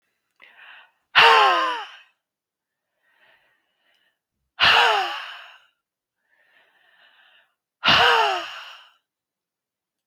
{"exhalation_length": "10.1 s", "exhalation_amplitude": 32768, "exhalation_signal_mean_std_ratio": 0.34, "survey_phase": "beta (2021-08-13 to 2022-03-07)", "age": "18-44", "gender": "Female", "wearing_mask": "No", "symptom_none": true, "smoker_status": "Never smoked", "respiratory_condition_asthma": false, "respiratory_condition_other": false, "recruitment_source": "REACT", "submission_delay": "1 day", "covid_test_result": "Negative", "covid_test_method": "RT-qPCR", "influenza_a_test_result": "Negative", "influenza_b_test_result": "Negative"}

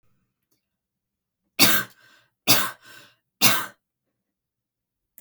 {"three_cough_length": "5.2 s", "three_cough_amplitude": 28660, "three_cough_signal_mean_std_ratio": 0.28, "survey_phase": "beta (2021-08-13 to 2022-03-07)", "age": "18-44", "gender": "Female", "wearing_mask": "No", "symptom_cough_any": true, "symptom_runny_or_blocked_nose": true, "symptom_sore_throat": true, "symptom_fever_high_temperature": true, "symptom_headache": true, "smoker_status": "Ex-smoker", "respiratory_condition_asthma": false, "respiratory_condition_other": false, "recruitment_source": "Test and Trace", "submission_delay": "2 days", "covid_test_result": "Positive", "covid_test_method": "RT-qPCR", "covid_ct_value": 21.6, "covid_ct_gene": "ORF1ab gene", "covid_ct_mean": 22.0, "covid_viral_load": "63000 copies/ml", "covid_viral_load_category": "Low viral load (10K-1M copies/ml)"}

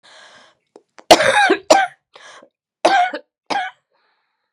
{"three_cough_length": "4.5 s", "three_cough_amplitude": 32768, "three_cough_signal_mean_std_ratio": 0.38, "survey_phase": "beta (2021-08-13 to 2022-03-07)", "age": "45-64", "gender": "Female", "wearing_mask": "Yes", "symptom_cough_any": true, "symptom_shortness_of_breath": true, "symptom_sore_throat": true, "symptom_abdominal_pain": true, "symptom_fatigue": true, "smoker_status": "Never smoked", "respiratory_condition_asthma": true, "respiratory_condition_other": false, "recruitment_source": "Test and Trace", "submission_delay": "1 day", "covid_test_result": "Positive", "covid_test_method": "RT-qPCR", "covid_ct_value": 22.7, "covid_ct_gene": "ORF1ab gene", "covid_ct_mean": 22.9, "covid_viral_load": "30000 copies/ml", "covid_viral_load_category": "Low viral load (10K-1M copies/ml)"}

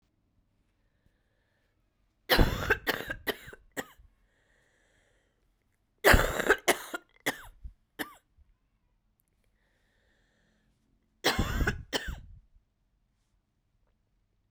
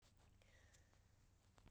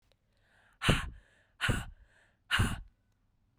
{"three_cough_length": "14.5 s", "three_cough_amplitude": 18082, "three_cough_signal_mean_std_ratio": 0.27, "cough_length": "1.7 s", "cough_amplitude": 141, "cough_signal_mean_std_ratio": 1.12, "exhalation_length": "3.6 s", "exhalation_amplitude": 8223, "exhalation_signal_mean_std_ratio": 0.37, "survey_phase": "beta (2021-08-13 to 2022-03-07)", "age": "45-64", "gender": "Female", "wearing_mask": "No", "symptom_cough_any": true, "symptom_runny_or_blocked_nose": true, "symptom_shortness_of_breath": true, "symptom_fatigue": true, "symptom_fever_high_temperature": true, "symptom_headache": true, "symptom_onset": "4 days", "smoker_status": "Never smoked", "respiratory_condition_asthma": false, "respiratory_condition_other": false, "recruitment_source": "Test and Trace", "submission_delay": "2 days", "covid_test_result": "Positive", "covid_test_method": "RT-qPCR"}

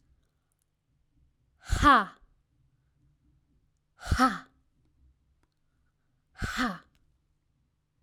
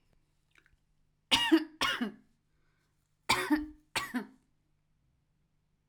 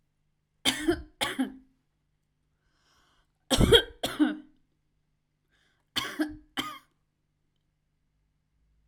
{"exhalation_length": "8.0 s", "exhalation_amplitude": 10577, "exhalation_signal_mean_std_ratio": 0.25, "cough_length": "5.9 s", "cough_amplitude": 9429, "cough_signal_mean_std_ratio": 0.33, "three_cough_length": "8.9 s", "three_cough_amplitude": 17383, "three_cough_signal_mean_std_ratio": 0.28, "survey_phase": "alpha (2021-03-01 to 2021-08-12)", "age": "18-44", "gender": "Female", "wearing_mask": "No", "symptom_headache": true, "smoker_status": "Never smoked", "respiratory_condition_asthma": false, "respiratory_condition_other": false, "recruitment_source": "REACT", "submission_delay": "1 day", "covid_test_result": "Negative", "covid_test_method": "RT-qPCR"}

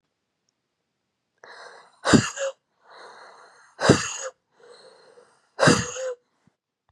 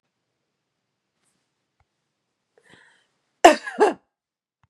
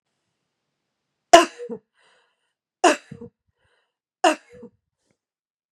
{"exhalation_length": "6.9 s", "exhalation_amplitude": 29687, "exhalation_signal_mean_std_ratio": 0.29, "cough_length": "4.7 s", "cough_amplitude": 32768, "cough_signal_mean_std_ratio": 0.16, "three_cough_length": "5.7 s", "three_cough_amplitude": 32768, "three_cough_signal_mean_std_ratio": 0.18, "survey_phase": "beta (2021-08-13 to 2022-03-07)", "age": "18-44", "gender": "Female", "wearing_mask": "No", "symptom_runny_or_blocked_nose": true, "smoker_status": "Never smoked", "respiratory_condition_asthma": true, "respiratory_condition_other": false, "recruitment_source": "Test and Trace", "submission_delay": "2 days", "covid_test_result": "Positive", "covid_test_method": "LFT"}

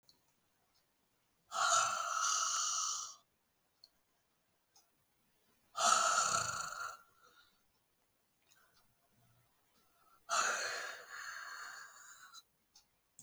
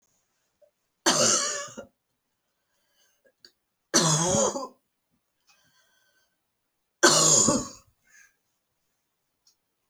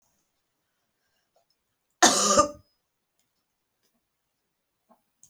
{"exhalation_length": "13.2 s", "exhalation_amplitude": 5181, "exhalation_signal_mean_std_ratio": 0.43, "three_cough_length": "9.9 s", "three_cough_amplitude": 21162, "three_cough_signal_mean_std_ratio": 0.34, "cough_length": "5.3 s", "cough_amplitude": 25370, "cough_signal_mean_std_ratio": 0.22, "survey_phase": "beta (2021-08-13 to 2022-03-07)", "age": "65+", "gender": "Female", "wearing_mask": "No", "symptom_cough_any": true, "symptom_runny_or_blocked_nose": true, "symptom_change_to_sense_of_smell_or_taste": true, "symptom_loss_of_taste": true, "symptom_other": true, "smoker_status": "Never smoked", "respiratory_condition_asthma": false, "respiratory_condition_other": false, "recruitment_source": "Test and Trace", "submission_delay": "1 day", "covid_test_result": "Positive", "covid_test_method": "RT-qPCR", "covid_ct_value": 21.7, "covid_ct_gene": "ORF1ab gene"}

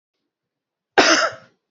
{"cough_length": "1.7 s", "cough_amplitude": 28225, "cough_signal_mean_std_ratio": 0.34, "survey_phase": "beta (2021-08-13 to 2022-03-07)", "age": "45-64", "gender": "Female", "wearing_mask": "No", "symptom_new_continuous_cough": true, "symptom_shortness_of_breath": true, "symptom_onset": "3 days", "smoker_status": "Never smoked", "respiratory_condition_asthma": true, "respiratory_condition_other": false, "recruitment_source": "Test and Trace", "submission_delay": "2 days", "covid_test_result": "Positive", "covid_test_method": "ePCR"}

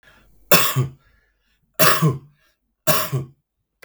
{"three_cough_length": "3.8 s", "three_cough_amplitude": 32768, "three_cough_signal_mean_std_ratio": 0.41, "survey_phase": "beta (2021-08-13 to 2022-03-07)", "age": "45-64", "gender": "Male", "wearing_mask": "No", "symptom_cough_any": true, "symptom_sore_throat": true, "smoker_status": "Ex-smoker", "respiratory_condition_asthma": false, "respiratory_condition_other": false, "recruitment_source": "REACT", "submission_delay": "14 days", "covid_test_result": "Negative", "covid_test_method": "RT-qPCR"}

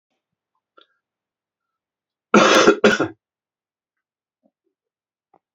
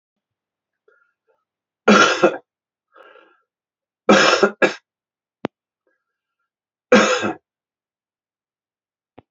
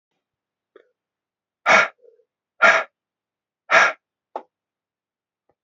{"cough_length": "5.5 s", "cough_amplitude": 32008, "cough_signal_mean_std_ratio": 0.26, "three_cough_length": "9.3 s", "three_cough_amplitude": 29095, "three_cough_signal_mean_std_ratio": 0.29, "exhalation_length": "5.6 s", "exhalation_amplitude": 28626, "exhalation_signal_mean_std_ratio": 0.26, "survey_phase": "beta (2021-08-13 to 2022-03-07)", "age": "45-64", "gender": "Male", "wearing_mask": "No", "symptom_new_continuous_cough": true, "symptom_runny_or_blocked_nose": true, "symptom_sore_throat": true, "symptom_onset": "3 days", "smoker_status": "Never smoked", "respiratory_condition_asthma": false, "respiratory_condition_other": false, "recruitment_source": "Test and Trace", "submission_delay": "1 day", "covid_test_result": "Positive", "covid_test_method": "ePCR"}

